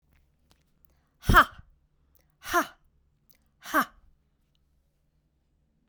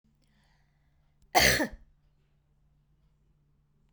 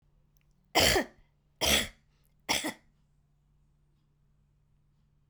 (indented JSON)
{
  "exhalation_length": "5.9 s",
  "exhalation_amplitude": 21025,
  "exhalation_signal_mean_std_ratio": 0.21,
  "cough_length": "3.9 s",
  "cough_amplitude": 13331,
  "cough_signal_mean_std_ratio": 0.23,
  "three_cough_length": "5.3 s",
  "three_cough_amplitude": 9271,
  "three_cough_signal_mean_std_ratio": 0.3,
  "survey_phase": "beta (2021-08-13 to 2022-03-07)",
  "age": "65+",
  "gender": "Female",
  "wearing_mask": "No",
  "symptom_none": true,
  "smoker_status": "Never smoked",
  "respiratory_condition_asthma": true,
  "respiratory_condition_other": false,
  "recruitment_source": "REACT",
  "submission_delay": "2 days",
  "covid_test_result": "Negative",
  "covid_test_method": "RT-qPCR"
}